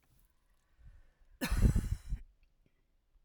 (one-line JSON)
{"cough_length": "3.2 s", "cough_amplitude": 6244, "cough_signal_mean_std_ratio": 0.34, "survey_phase": "alpha (2021-03-01 to 2021-08-12)", "age": "18-44", "gender": "Female", "wearing_mask": "No", "symptom_none": true, "symptom_onset": "2 days", "smoker_status": "Ex-smoker", "respiratory_condition_asthma": false, "respiratory_condition_other": false, "recruitment_source": "REACT", "submission_delay": "4 days", "covid_test_result": "Negative", "covid_test_method": "RT-qPCR"}